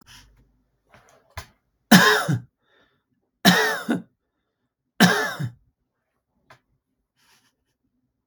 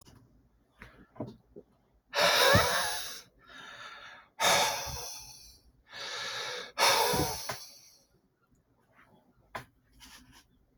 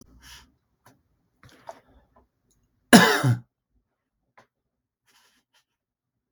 {"three_cough_length": "8.3 s", "three_cough_amplitude": 32768, "three_cough_signal_mean_std_ratio": 0.29, "exhalation_length": "10.8 s", "exhalation_amplitude": 10469, "exhalation_signal_mean_std_ratio": 0.43, "cough_length": "6.3 s", "cough_amplitude": 32767, "cough_signal_mean_std_ratio": 0.19, "survey_phase": "beta (2021-08-13 to 2022-03-07)", "age": "45-64", "gender": "Male", "wearing_mask": "No", "symptom_none": true, "smoker_status": "Ex-smoker", "respiratory_condition_asthma": true, "respiratory_condition_other": false, "recruitment_source": "REACT", "submission_delay": "2 days", "covid_test_result": "Negative", "covid_test_method": "RT-qPCR", "influenza_a_test_result": "Unknown/Void", "influenza_b_test_result": "Unknown/Void"}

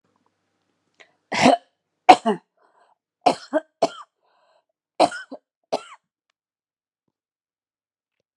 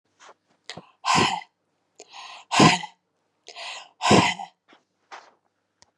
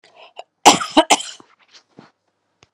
{"three_cough_length": "8.4 s", "three_cough_amplitude": 32768, "three_cough_signal_mean_std_ratio": 0.21, "exhalation_length": "6.0 s", "exhalation_amplitude": 25058, "exhalation_signal_mean_std_ratio": 0.33, "cough_length": "2.7 s", "cough_amplitude": 32768, "cough_signal_mean_std_ratio": 0.26, "survey_phase": "beta (2021-08-13 to 2022-03-07)", "age": "45-64", "gender": "Female", "wearing_mask": "No", "symptom_cough_any": true, "symptom_runny_or_blocked_nose": true, "symptom_sore_throat": true, "symptom_onset": "4 days", "smoker_status": "Never smoked", "respiratory_condition_asthma": false, "respiratory_condition_other": false, "recruitment_source": "Test and Trace", "submission_delay": "2 days", "covid_test_result": "Positive", "covid_test_method": "RT-qPCR", "covid_ct_value": 16.4, "covid_ct_gene": "ORF1ab gene", "covid_ct_mean": 17.0, "covid_viral_load": "2700000 copies/ml", "covid_viral_load_category": "High viral load (>1M copies/ml)"}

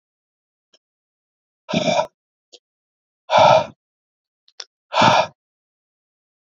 {"exhalation_length": "6.6 s", "exhalation_amplitude": 27676, "exhalation_signal_mean_std_ratio": 0.3, "survey_phase": "beta (2021-08-13 to 2022-03-07)", "age": "45-64", "gender": "Male", "wearing_mask": "No", "symptom_none": true, "smoker_status": "Never smoked", "respiratory_condition_asthma": false, "respiratory_condition_other": false, "recruitment_source": "REACT", "submission_delay": "1 day", "covid_test_result": "Negative", "covid_test_method": "RT-qPCR", "influenza_a_test_result": "Negative", "influenza_b_test_result": "Negative"}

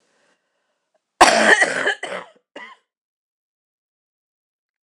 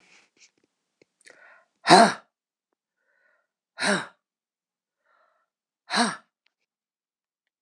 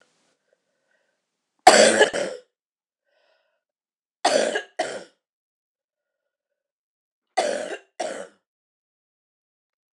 {"cough_length": "4.8 s", "cough_amplitude": 26028, "cough_signal_mean_std_ratio": 0.29, "exhalation_length": "7.6 s", "exhalation_amplitude": 25971, "exhalation_signal_mean_std_ratio": 0.2, "three_cough_length": "9.9 s", "three_cough_amplitude": 26028, "three_cough_signal_mean_std_ratio": 0.26, "survey_phase": "beta (2021-08-13 to 2022-03-07)", "age": "65+", "gender": "Female", "wearing_mask": "No", "symptom_cough_any": true, "symptom_runny_or_blocked_nose": true, "symptom_sore_throat": true, "symptom_fatigue": true, "symptom_headache": true, "symptom_change_to_sense_of_smell_or_taste": true, "symptom_loss_of_taste": true, "symptom_onset": "3 days", "smoker_status": "Ex-smoker", "respiratory_condition_asthma": false, "respiratory_condition_other": false, "recruitment_source": "Test and Trace", "submission_delay": "2 days", "covid_test_result": "Positive", "covid_test_method": "ePCR"}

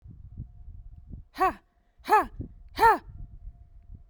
{"exhalation_length": "4.1 s", "exhalation_amplitude": 15020, "exhalation_signal_mean_std_ratio": 0.37, "survey_phase": "beta (2021-08-13 to 2022-03-07)", "age": "18-44", "gender": "Female", "wearing_mask": "No", "symptom_sore_throat": true, "symptom_fever_high_temperature": true, "smoker_status": "Never smoked", "respiratory_condition_asthma": false, "respiratory_condition_other": false, "recruitment_source": "Test and Trace", "submission_delay": "2 days", "covid_test_result": "Positive", "covid_test_method": "RT-qPCR", "covid_ct_value": 27.5, "covid_ct_gene": "ORF1ab gene", "covid_ct_mean": 28.2, "covid_viral_load": "540 copies/ml", "covid_viral_load_category": "Minimal viral load (< 10K copies/ml)"}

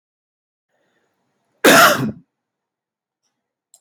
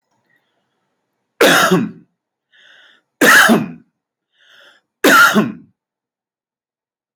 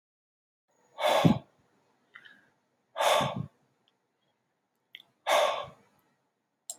{"cough_length": "3.8 s", "cough_amplitude": 32768, "cough_signal_mean_std_ratio": 0.26, "three_cough_length": "7.2 s", "three_cough_amplitude": 32767, "three_cough_signal_mean_std_ratio": 0.37, "exhalation_length": "6.8 s", "exhalation_amplitude": 12465, "exhalation_signal_mean_std_ratio": 0.33, "survey_phase": "alpha (2021-03-01 to 2021-08-12)", "age": "45-64", "gender": "Male", "wearing_mask": "No", "symptom_none": true, "smoker_status": "Ex-smoker", "respiratory_condition_asthma": false, "respiratory_condition_other": false, "recruitment_source": "REACT", "submission_delay": "2 days", "covid_test_result": "Negative", "covid_test_method": "RT-qPCR"}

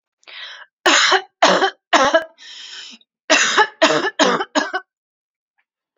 {"cough_length": "6.0 s", "cough_amplitude": 30381, "cough_signal_mean_std_ratio": 0.48, "survey_phase": "beta (2021-08-13 to 2022-03-07)", "age": "18-44", "gender": "Female", "wearing_mask": "No", "symptom_none": true, "smoker_status": "Never smoked", "respiratory_condition_asthma": false, "respiratory_condition_other": false, "recruitment_source": "REACT", "submission_delay": "2 days", "covid_test_result": "Negative", "covid_test_method": "RT-qPCR", "influenza_a_test_result": "Unknown/Void", "influenza_b_test_result": "Unknown/Void"}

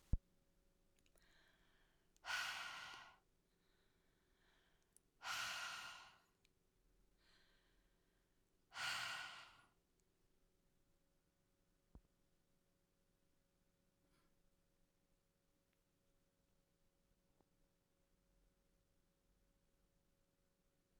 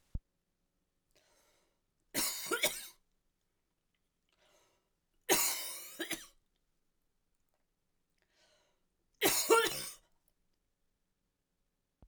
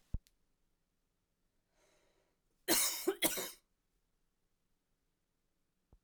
{"exhalation_length": "21.0 s", "exhalation_amplitude": 2007, "exhalation_signal_mean_std_ratio": 0.28, "three_cough_length": "12.1 s", "three_cough_amplitude": 6467, "three_cough_signal_mean_std_ratio": 0.29, "cough_length": "6.0 s", "cough_amplitude": 4099, "cough_signal_mean_std_ratio": 0.26, "survey_phase": "alpha (2021-03-01 to 2021-08-12)", "age": "45-64", "gender": "Female", "wearing_mask": "No", "symptom_cough_any": true, "symptom_fatigue": true, "smoker_status": "Ex-smoker", "respiratory_condition_asthma": false, "respiratory_condition_other": false, "recruitment_source": "Test and Trace", "submission_delay": "2 days", "covid_test_result": "Positive", "covid_test_method": "RT-qPCR", "covid_ct_value": 19.8, "covid_ct_gene": "ORF1ab gene", "covid_ct_mean": 20.3, "covid_viral_load": "230000 copies/ml", "covid_viral_load_category": "Low viral load (10K-1M copies/ml)"}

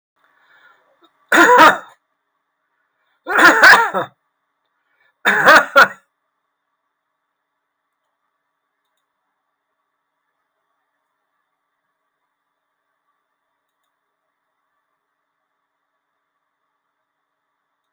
{"three_cough_length": "17.9 s", "three_cough_amplitude": 32768, "three_cough_signal_mean_std_ratio": 0.23, "survey_phase": "alpha (2021-03-01 to 2021-08-12)", "age": "65+", "gender": "Male", "wearing_mask": "No", "symptom_none": true, "smoker_status": "Ex-smoker", "respiratory_condition_asthma": false, "respiratory_condition_other": true, "recruitment_source": "REACT", "submission_delay": "1 day", "covid_test_result": "Negative", "covid_test_method": "RT-qPCR"}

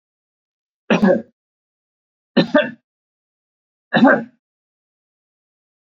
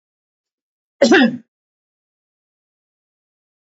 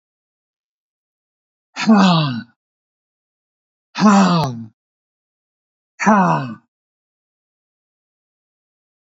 {"three_cough_length": "6.0 s", "three_cough_amplitude": 28127, "three_cough_signal_mean_std_ratio": 0.29, "cough_length": "3.8 s", "cough_amplitude": 28513, "cough_signal_mean_std_ratio": 0.23, "exhalation_length": "9.0 s", "exhalation_amplitude": 27549, "exhalation_signal_mean_std_ratio": 0.35, "survey_phase": "beta (2021-08-13 to 2022-03-07)", "age": "65+", "gender": "Male", "wearing_mask": "No", "symptom_none": true, "smoker_status": "Ex-smoker", "respiratory_condition_asthma": false, "respiratory_condition_other": false, "recruitment_source": "REACT", "submission_delay": "1 day", "covid_test_result": "Negative", "covid_test_method": "RT-qPCR", "influenza_a_test_result": "Negative", "influenza_b_test_result": "Negative"}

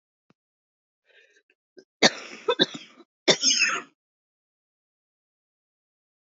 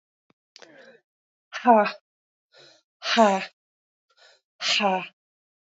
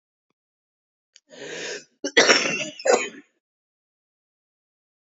{"three_cough_length": "6.2 s", "three_cough_amplitude": 26455, "three_cough_signal_mean_std_ratio": 0.26, "exhalation_length": "5.6 s", "exhalation_amplitude": 20957, "exhalation_signal_mean_std_ratio": 0.32, "cough_length": "5.0 s", "cough_amplitude": 31917, "cough_signal_mean_std_ratio": 0.31, "survey_phase": "beta (2021-08-13 to 2022-03-07)", "age": "18-44", "gender": "Female", "wearing_mask": "No", "symptom_cough_any": true, "symptom_runny_or_blocked_nose": true, "symptom_shortness_of_breath": true, "symptom_fatigue": true, "symptom_fever_high_temperature": true, "symptom_headache": true, "symptom_change_to_sense_of_smell_or_taste": true, "symptom_loss_of_taste": true, "symptom_onset": "4 days", "smoker_status": "Current smoker (11 or more cigarettes per day)", "respiratory_condition_asthma": false, "respiratory_condition_other": false, "recruitment_source": "Test and Trace", "submission_delay": "1 day", "covid_test_result": "Negative", "covid_test_method": "RT-qPCR"}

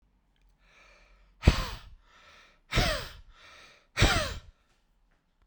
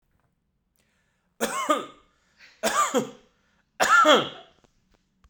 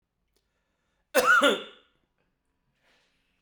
{"exhalation_length": "5.5 s", "exhalation_amplitude": 19405, "exhalation_signal_mean_std_ratio": 0.31, "three_cough_length": "5.3 s", "three_cough_amplitude": 18853, "three_cough_signal_mean_std_ratio": 0.37, "cough_length": "3.4 s", "cough_amplitude": 14969, "cough_signal_mean_std_ratio": 0.29, "survey_phase": "beta (2021-08-13 to 2022-03-07)", "age": "45-64", "gender": "Male", "wearing_mask": "No", "symptom_runny_or_blocked_nose": true, "symptom_onset": "12 days", "smoker_status": "Ex-smoker", "respiratory_condition_asthma": false, "respiratory_condition_other": false, "recruitment_source": "REACT", "submission_delay": "1 day", "covid_test_result": "Negative", "covid_test_method": "RT-qPCR"}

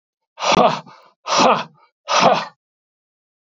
{"exhalation_length": "3.4 s", "exhalation_amplitude": 30933, "exhalation_signal_mean_std_ratio": 0.45, "survey_phase": "beta (2021-08-13 to 2022-03-07)", "age": "65+", "gender": "Male", "wearing_mask": "No", "symptom_none": true, "smoker_status": "Never smoked", "respiratory_condition_asthma": false, "respiratory_condition_other": false, "recruitment_source": "REACT", "submission_delay": "7 days", "covid_test_result": "Negative", "covid_test_method": "RT-qPCR", "influenza_a_test_result": "Negative", "influenza_b_test_result": "Negative"}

